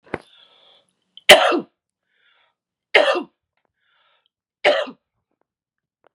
{"three_cough_length": "6.1 s", "three_cough_amplitude": 32768, "three_cough_signal_mean_std_ratio": 0.25, "survey_phase": "beta (2021-08-13 to 2022-03-07)", "age": "65+", "gender": "Female", "wearing_mask": "No", "symptom_cough_any": true, "symptom_runny_or_blocked_nose": true, "smoker_status": "Never smoked", "respiratory_condition_asthma": false, "respiratory_condition_other": false, "recruitment_source": "REACT", "submission_delay": "0 days", "covid_test_result": "Positive", "covid_test_method": "RT-qPCR", "covid_ct_value": 22.4, "covid_ct_gene": "E gene", "influenza_a_test_result": "Negative", "influenza_b_test_result": "Negative"}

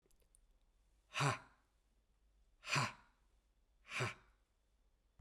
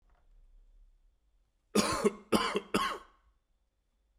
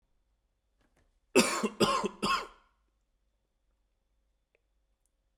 {"exhalation_length": "5.2 s", "exhalation_amplitude": 2345, "exhalation_signal_mean_std_ratio": 0.31, "three_cough_length": "4.2 s", "three_cough_amplitude": 8722, "three_cough_signal_mean_std_ratio": 0.36, "cough_length": "5.4 s", "cough_amplitude": 13962, "cough_signal_mean_std_ratio": 0.29, "survey_phase": "beta (2021-08-13 to 2022-03-07)", "age": "45-64", "gender": "Male", "wearing_mask": "No", "symptom_cough_any": true, "symptom_new_continuous_cough": true, "symptom_runny_or_blocked_nose": true, "symptom_shortness_of_breath": true, "symptom_sore_throat": true, "symptom_fatigue": true, "symptom_fever_high_temperature": true, "symptom_onset": "3 days", "smoker_status": "Ex-smoker", "respiratory_condition_asthma": false, "respiratory_condition_other": false, "recruitment_source": "Test and Trace", "submission_delay": "1 day", "covid_test_result": "Positive", "covid_test_method": "RT-qPCR", "covid_ct_value": 14.9, "covid_ct_gene": "ORF1ab gene", "covid_ct_mean": 15.3, "covid_viral_load": "9700000 copies/ml", "covid_viral_load_category": "High viral load (>1M copies/ml)"}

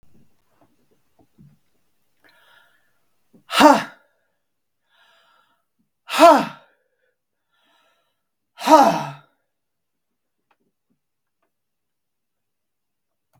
{"exhalation_length": "13.4 s", "exhalation_amplitude": 32768, "exhalation_signal_mean_std_ratio": 0.21, "survey_phase": "beta (2021-08-13 to 2022-03-07)", "age": "65+", "gender": "Female", "wearing_mask": "No", "symptom_none": true, "symptom_onset": "12 days", "smoker_status": "Ex-smoker", "respiratory_condition_asthma": false, "respiratory_condition_other": false, "recruitment_source": "REACT", "submission_delay": "2 days", "covid_test_result": "Negative", "covid_test_method": "RT-qPCR", "influenza_a_test_result": "Negative", "influenza_b_test_result": "Negative"}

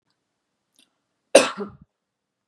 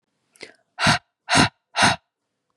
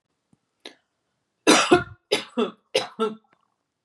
{"cough_length": "2.5 s", "cough_amplitude": 32768, "cough_signal_mean_std_ratio": 0.18, "exhalation_length": "2.6 s", "exhalation_amplitude": 23425, "exhalation_signal_mean_std_ratio": 0.37, "three_cough_length": "3.8 s", "three_cough_amplitude": 27027, "three_cough_signal_mean_std_ratio": 0.33, "survey_phase": "beta (2021-08-13 to 2022-03-07)", "age": "18-44", "gender": "Female", "wearing_mask": "No", "symptom_none": true, "smoker_status": "Never smoked", "respiratory_condition_asthma": false, "respiratory_condition_other": false, "recruitment_source": "REACT", "submission_delay": "2 days", "covid_test_result": "Negative", "covid_test_method": "RT-qPCR", "influenza_a_test_result": "Negative", "influenza_b_test_result": "Negative"}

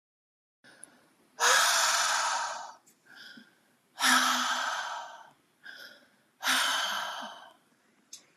{"exhalation_length": "8.4 s", "exhalation_amplitude": 10168, "exhalation_signal_mean_std_ratio": 0.52, "survey_phase": "beta (2021-08-13 to 2022-03-07)", "age": "18-44", "gender": "Female", "wearing_mask": "No", "symptom_fatigue": true, "smoker_status": "Never smoked", "respiratory_condition_asthma": false, "respiratory_condition_other": false, "recruitment_source": "REACT", "submission_delay": "3 days", "covid_test_result": "Negative", "covid_test_method": "RT-qPCR", "influenza_a_test_result": "Negative", "influenza_b_test_result": "Negative"}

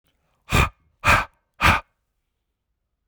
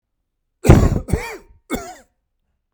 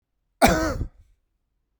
{"exhalation_length": "3.1 s", "exhalation_amplitude": 25235, "exhalation_signal_mean_std_ratio": 0.33, "three_cough_length": "2.7 s", "three_cough_amplitude": 32768, "three_cough_signal_mean_std_ratio": 0.32, "cough_length": "1.8 s", "cough_amplitude": 29784, "cough_signal_mean_std_ratio": 0.36, "survey_phase": "beta (2021-08-13 to 2022-03-07)", "age": "45-64", "gender": "Male", "wearing_mask": "No", "symptom_cough_any": true, "symptom_fatigue": true, "symptom_change_to_sense_of_smell_or_taste": true, "symptom_onset": "3 days", "smoker_status": "Ex-smoker", "respiratory_condition_asthma": false, "respiratory_condition_other": false, "recruitment_source": "Test and Trace", "submission_delay": "2 days", "covid_test_result": "Positive", "covid_test_method": "RT-qPCR", "covid_ct_value": 25.8, "covid_ct_gene": "ORF1ab gene"}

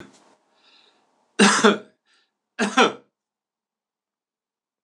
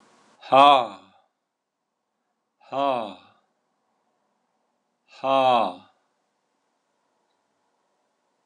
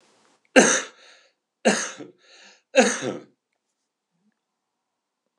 {"cough_length": "4.8 s", "cough_amplitude": 25904, "cough_signal_mean_std_ratio": 0.27, "exhalation_length": "8.5 s", "exhalation_amplitude": 25856, "exhalation_signal_mean_std_ratio": 0.26, "three_cough_length": "5.4 s", "three_cough_amplitude": 26028, "three_cough_signal_mean_std_ratio": 0.28, "survey_phase": "alpha (2021-03-01 to 2021-08-12)", "age": "65+", "gender": "Male", "wearing_mask": "No", "symptom_cough_any": true, "symptom_change_to_sense_of_smell_or_taste": true, "symptom_loss_of_taste": true, "smoker_status": "Never smoked", "respiratory_condition_asthma": false, "respiratory_condition_other": false, "recruitment_source": "Test and Trace", "submission_delay": "2 days", "covid_test_result": "Positive", "covid_test_method": "RT-qPCR"}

